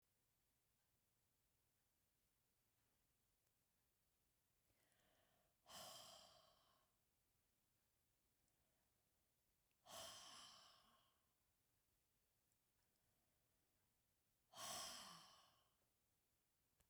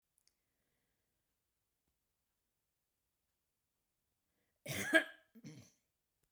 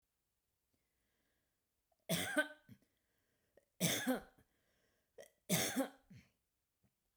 {"exhalation_length": "16.9 s", "exhalation_amplitude": 288, "exhalation_signal_mean_std_ratio": 0.35, "cough_length": "6.3 s", "cough_amplitude": 5382, "cough_signal_mean_std_ratio": 0.16, "three_cough_length": "7.2 s", "three_cough_amplitude": 3119, "three_cough_signal_mean_std_ratio": 0.32, "survey_phase": "beta (2021-08-13 to 2022-03-07)", "age": "65+", "gender": "Female", "wearing_mask": "No", "symptom_none": true, "smoker_status": "Ex-smoker", "respiratory_condition_asthma": false, "respiratory_condition_other": false, "recruitment_source": "REACT", "submission_delay": "1 day", "covid_test_result": "Negative", "covid_test_method": "RT-qPCR"}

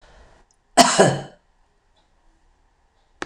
{"cough_length": "3.3 s", "cough_amplitude": 26028, "cough_signal_mean_std_ratio": 0.27, "survey_phase": "beta (2021-08-13 to 2022-03-07)", "age": "65+", "gender": "Female", "wearing_mask": "No", "symptom_none": true, "symptom_onset": "4 days", "smoker_status": "Never smoked", "respiratory_condition_asthma": false, "respiratory_condition_other": false, "recruitment_source": "REACT", "submission_delay": "2 days", "covid_test_result": "Negative", "covid_test_method": "RT-qPCR"}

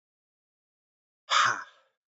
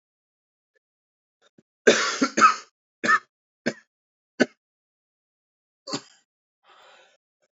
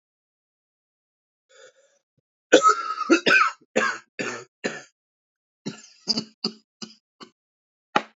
{"exhalation_length": "2.1 s", "exhalation_amplitude": 9635, "exhalation_signal_mean_std_ratio": 0.29, "three_cough_length": "7.6 s", "three_cough_amplitude": 26481, "three_cough_signal_mean_std_ratio": 0.24, "cough_length": "8.2 s", "cough_amplitude": 27688, "cough_signal_mean_std_ratio": 0.3, "survey_phase": "beta (2021-08-13 to 2022-03-07)", "age": "18-44", "gender": "Male", "wearing_mask": "No", "symptom_cough_any": true, "symptom_new_continuous_cough": true, "symptom_runny_or_blocked_nose": true, "symptom_shortness_of_breath": true, "symptom_sore_throat": true, "symptom_onset": "5 days", "smoker_status": "Never smoked", "respiratory_condition_asthma": true, "respiratory_condition_other": false, "recruitment_source": "Test and Trace", "submission_delay": "2 days", "covid_test_result": "Positive", "covid_test_method": "RT-qPCR", "covid_ct_value": 20.6, "covid_ct_gene": "ORF1ab gene"}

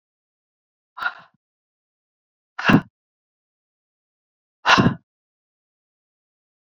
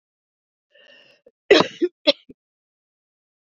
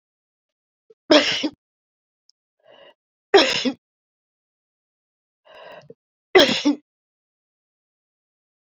{"exhalation_length": "6.7 s", "exhalation_amplitude": 27152, "exhalation_signal_mean_std_ratio": 0.21, "cough_length": "3.5 s", "cough_amplitude": 28992, "cough_signal_mean_std_ratio": 0.21, "three_cough_length": "8.8 s", "three_cough_amplitude": 29190, "three_cough_signal_mean_std_ratio": 0.25, "survey_phase": "beta (2021-08-13 to 2022-03-07)", "age": "65+", "gender": "Female", "wearing_mask": "No", "symptom_cough_any": true, "symptom_runny_or_blocked_nose": true, "symptom_sore_throat": true, "symptom_fatigue": true, "symptom_headache": true, "symptom_onset": "5 days", "smoker_status": "Ex-smoker", "respiratory_condition_asthma": false, "respiratory_condition_other": false, "recruitment_source": "Test and Trace", "submission_delay": "1 day", "covid_test_result": "Positive", "covid_test_method": "RT-qPCR"}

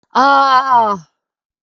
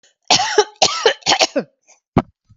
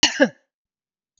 {"exhalation_length": "1.6 s", "exhalation_amplitude": 32768, "exhalation_signal_mean_std_ratio": 0.61, "three_cough_length": "2.6 s", "three_cough_amplitude": 32768, "three_cough_signal_mean_std_ratio": 0.45, "cough_length": "1.2 s", "cough_amplitude": 32766, "cough_signal_mean_std_ratio": 0.29, "survey_phase": "beta (2021-08-13 to 2022-03-07)", "age": "45-64", "gender": "Female", "wearing_mask": "No", "symptom_none": true, "smoker_status": "Never smoked", "respiratory_condition_asthma": true, "respiratory_condition_other": false, "recruitment_source": "REACT", "submission_delay": "6 days", "covid_test_result": "Negative", "covid_test_method": "RT-qPCR", "influenza_a_test_result": "Negative", "influenza_b_test_result": "Negative"}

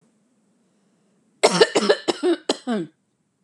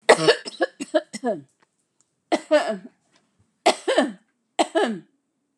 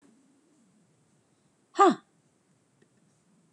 {"cough_length": "3.4 s", "cough_amplitude": 32651, "cough_signal_mean_std_ratio": 0.37, "three_cough_length": "5.6 s", "three_cough_amplitude": 31966, "three_cough_signal_mean_std_ratio": 0.38, "exhalation_length": "3.5 s", "exhalation_amplitude": 14840, "exhalation_signal_mean_std_ratio": 0.18, "survey_phase": "beta (2021-08-13 to 2022-03-07)", "age": "45-64", "gender": "Female", "wearing_mask": "No", "symptom_cough_any": true, "symptom_runny_or_blocked_nose": true, "smoker_status": "Never smoked", "respiratory_condition_asthma": true, "respiratory_condition_other": false, "recruitment_source": "REACT", "submission_delay": "2 days", "covid_test_result": "Negative", "covid_test_method": "RT-qPCR", "covid_ct_value": 46.0, "covid_ct_gene": "E gene"}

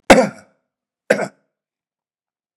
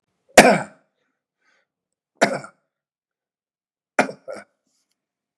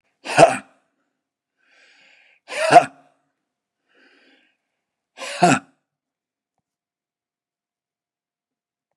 {"cough_length": "2.6 s", "cough_amplitude": 32768, "cough_signal_mean_std_ratio": 0.24, "three_cough_length": "5.4 s", "three_cough_amplitude": 32768, "three_cough_signal_mean_std_ratio": 0.2, "exhalation_length": "9.0 s", "exhalation_amplitude": 32768, "exhalation_signal_mean_std_ratio": 0.2, "survey_phase": "beta (2021-08-13 to 2022-03-07)", "age": "45-64", "gender": "Male", "wearing_mask": "No", "symptom_none": true, "smoker_status": "Ex-smoker", "respiratory_condition_asthma": false, "respiratory_condition_other": false, "recruitment_source": "REACT", "submission_delay": "3 days", "covid_test_result": "Negative", "covid_test_method": "RT-qPCR", "influenza_a_test_result": "Negative", "influenza_b_test_result": "Negative"}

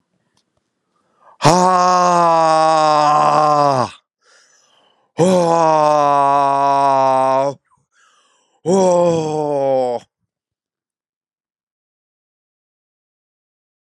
{"exhalation_length": "13.9 s", "exhalation_amplitude": 32768, "exhalation_signal_mean_std_ratio": 0.56, "survey_phase": "beta (2021-08-13 to 2022-03-07)", "age": "18-44", "gender": "Male", "wearing_mask": "No", "symptom_none": true, "symptom_onset": "12 days", "smoker_status": "Ex-smoker", "respiratory_condition_asthma": true, "respiratory_condition_other": false, "recruitment_source": "Test and Trace", "submission_delay": "5 days", "covid_test_method": "RT-qPCR"}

